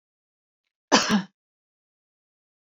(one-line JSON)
{"cough_length": "2.7 s", "cough_amplitude": 27408, "cough_signal_mean_std_ratio": 0.24, "survey_phase": "alpha (2021-03-01 to 2021-08-12)", "age": "45-64", "gender": "Female", "wearing_mask": "No", "symptom_none": true, "smoker_status": "Never smoked", "respiratory_condition_asthma": false, "respiratory_condition_other": false, "recruitment_source": "REACT", "submission_delay": "4 days", "covid_test_result": "Negative", "covid_test_method": "RT-qPCR"}